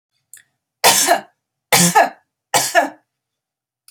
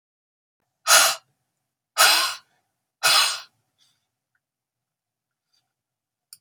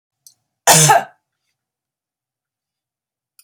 three_cough_length: 3.9 s
three_cough_amplitude: 32767
three_cough_signal_mean_std_ratio: 0.4
exhalation_length: 6.4 s
exhalation_amplitude: 28926
exhalation_signal_mean_std_ratio: 0.3
cough_length: 3.4 s
cough_amplitude: 32768
cough_signal_mean_std_ratio: 0.26
survey_phase: beta (2021-08-13 to 2022-03-07)
age: 45-64
gender: Female
wearing_mask: 'No'
symptom_none: true
smoker_status: Never smoked
respiratory_condition_asthma: false
respiratory_condition_other: false
recruitment_source: REACT
submission_delay: 1 day
covid_test_result: Negative
covid_test_method: RT-qPCR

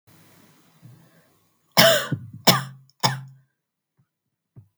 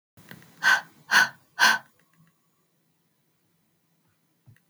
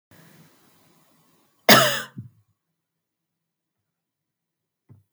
three_cough_length: 4.8 s
three_cough_amplitude: 32768
three_cough_signal_mean_std_ratio: 0.28
exhalation_length: 4.7 s
exhalation_amplitude: 18588
exhalation_signal_mean_std_ratio: 0.27
cough_length: 5.1 s
cough_amplitude: 32768
cough_signal_mean_std_ratio: 0.19
survey_phase: beta (2021-08-13 to 2022-03-07)
age: 18-44
gender: Female
wearing_mask: 'No'
symptom_none: true
symptom_onset: 13 days
smoker_status: Never smoked
respiratory_condition_asthma: false
respiratory_condition_other: false
recruitment_source: REACT
submission_delay: 2 days
covid_test_result: Negative
covid_test_method: RT-qPCR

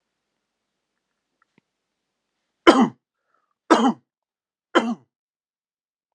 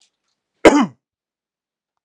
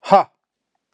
three_cough_length: 6.1 s
three_cough_amplitude: 32767
three_cough_signal_mean_std_ratio: 0.22
cough_length: 2.0 s
cough_amplitude: 32768
cough_signal_mean_std_ratio: 0.23
exhalation_length: 0.9 s
exhalation_amplitude: 32768
exhalation_signal_mean_std_ratio: 0.29
survey_phase: alpha (2021-03-01 to 2021-08-12)
age: 45-64
gender: Male
wearing_mask: 'No'
symptom_none: true
smoker_status: Never smoked
respiratory_condition_asthma: false
respiratory_condition_other: false
recruitment_source: REACT
submission_delay: 2 days
covid_test_result: Negative
covid_test_method: RT-qPCR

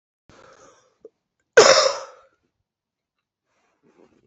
cough_length: 4.3 s
cough_amplitude: 29645
cough_signal_mean_std_ratio: 0.23
survey_phase: beta (2021-08-13 to 2022-03-07)
age: 18-44
gender: Female
wearing_mask: 'No'
symptom_cough_any: true
symptom_runny_or_blocked_nose: true
symptom_shortness_of_breath: true
symptom_fatigue: true
symptom_headache: true
symptom_change_to_sense_of_smell_or_taste: true
symptom_loss_of_taste: true
symptom_onset: 3 days
smoker_status: Ex-smoker
respiratory_condition_asthma: true
respiratory_condition_other: false
recruitment_source: Test and Trace
submission_delay: 2 days
covid_test_result: Positive
covid_test_method: RT-qPCR
covid_ct_value: 16.6
covid_ct_gene: ORF1ab gene
covid_ct_mean: 17.1
covid_viral_load: 2400000 copies/ml
covid_viral_load_category: High viral load (>1M copies/ml)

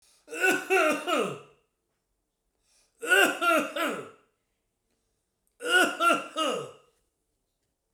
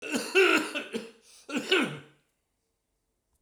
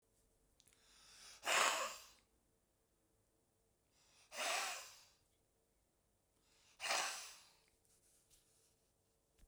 three_cough_length: 7.9 s
three_cough_amplitude: 13233
three_cough_signal_mean_std_ratio: 0.46
cough_length: 3.4 s
cough_amplitude: 10500
cough_signal_mean_std_ratio: 0.44
exhalation_length: 9.5 s
exhalation_amplitude: 2909
exhalation_signal_mean_std_ratio: 0.32
survey_phase: beta (2021-08-13 to 2022-03-07)
age: 65+
gender: Male
wearing_mask: 'No'
symptom_none: true
smoker_status: Ex-smoker
respiratory_condition_asthma: false
respiratory_condition_other: false
recruitment_source: REACT
submission_delay: 2 days
covid_test_result: Negative
covid_test_method: RT-qPCR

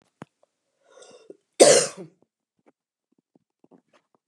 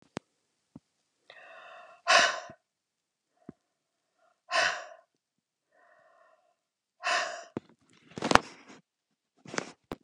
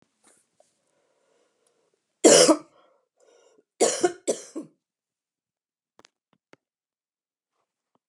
cough_length: 4.3 s
cough_amplitude: 32623
cough_signal_mean_std_ratio: 0.2
exhalation_length: 10.0 s
exhalation_amplitude: 32768
exhalation_signal_mean_std_ratio: 0.25
three_cough_length: 8.1 s
three_cough_amplitude: 28249
three_cough_signal_mean_std_ratio: 0.21
survey_phase: beta (2021-08-13 to 2022-03-07)
age: 45-64
gender: Female
wearing_mask: 'No'
symptom_cough_any: true
symptom_runny_or_blocked_nose: true
smoker_status: Never smoked
respiratory_condition_asthma: false
respiratory_condition_other: false
recruitment_source: Test and Trace
submission_delay: 1 day
covid_test_result: Positive
covid_test_method: RT-qPCR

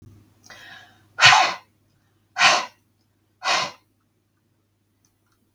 exhalation_length: 5.5 s
exhalation_amplitude: 32768
exhalation_signal_mean_std_ratio: 0.29
survey_phase: beta (2021-08-13 to 2022-03-07)
age: 45-64
gender: Female
wearing_mask: 'No'
symptom_none: true
smoker_status: Never smoked
respiratory_condition_asthma: false
respiratory_condition_other: false
recruitment_source: REACT
submission_delay: 1 day
covid_test_result: Negative
covid_test_method: RT-qPCR
influenza_a_test_result: Unknown/Void
influenza_b_test_result: Unknown/Void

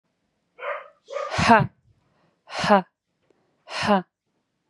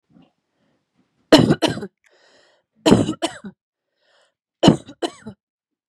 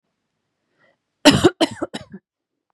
exhalation_length: 4.7 s
exhalation_amplitude: 29598
exhalation_signal_mean_std_ratio: 0.33
three_cough_length: 5.9 s
three_cough_amplitude: 32768
three_cough_signal_mean_std_ratio: 0.28
cough_length: 2.7 s
cough_amplitude: 32767
cough_signal_mean_std_ratio: 0.26
survey_phase: beta (2021-08-13 to 2022-03-07)
age: 18-44
gender: Female
wearing_mask: 'No'
symptom_headache: true
symptom_onset: 11 days
smoker_status: Never smoked
respiratory_condition_asthma: false
respiratory_condition_other: false
recruitment_source: REACT
submission_delay: 1 day
covid_test_result: Negative
covid_test_method: RT-qPCR
influenza_a_test_result: Negative
influenza_b_test_result: Negative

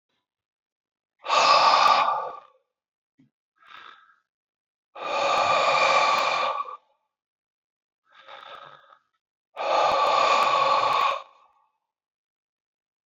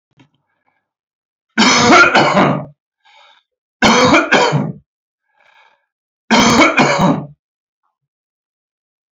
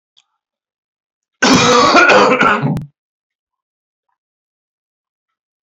exhalation_length: 13.1 s
exhalation_amplitude: 18740
exhalation_signal_mean_std_ratio: 0.5
three_cough_length: 9.1 s
three_cough_amplitude: 30773
three_cough_signal_mean_std_ratio: 0.47
cough_length: 5.6 s
cough_amplitude: 32195
cough_signal_mean_std_ratio: 0.42
survey_phase: beta (2021-08-13 to 2022-03-07)
age: 65+
gender: Male
wearing_mask: 'No'
symptom_none: true
smoker_status: Never smoked
respiratory_condition_asthma: false
respiratory_condition_other: false
recruitment_source: REACT
submission_delay: 2 days
covid_test_result: Negative
covid_test_method: RT-qPCR
influenza_a_test_result: Negative
influenza_b_test_result: Negative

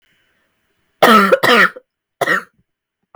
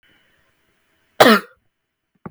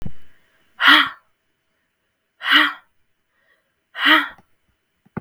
three_cough_length: 3.2 s
three_cough_amplitude: 32768
three_cough_signal_mean_std_ratio: 0.41
cough_length: 2.3 s
cough_amplitude: 32768
cough_signal_mean_std_ratio: 0.23
exhalation_length: 5.2 s
exhalation_amplitude: 32768
exhalation_signal_mean_std_ratio: 0.35
survey_phase: beta (2021-08-13 to 2022-03-07)
age: 18-44
gender: Female
wearing_mask: 'No'
symptom_cough_any: true
symptom_new_continuous_cough: true
symptom_runny_or_blocked_nose: true
symptom_fatigue: true
symptom_headache: true
symptom_change_to_sense_of_smell_or_taste: true
symptom_loss_of_taste: true
symptom_other: true
symptom_onset: 4 days
smoker_status: Never smoked
respiratory_condition_asthma: false
respiratory_condition_other: false
recruitment_source: Test and Trace
submission_delay: 1 day
covid_test_result: Positive
covid_test_method: RT-qPCR
covid_ct_value: 21.1
covid_ct_gene: ORF1ab gene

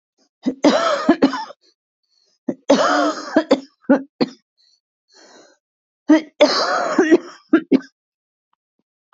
three_cough_length: 9.1 s
three_cough_amplitude: 27996
three_cough_signal_mean_std_ratio: 0.42
survey_phase: beta (2021-08-13 to 2022-03-07)
age: 45-64
gender: Female
wearing_mask: 'No'
symptom_cough_any: true
symptom_runny_or_blocked_nose: true
smoker_status: Never smoked
respiratory_condition_asthma: false
respiratory_condition_other: false
recruitment_source: Test and Trace
submission_delay: 2 days
covid_test_result: Negative
covid_test_method: RT-qPCR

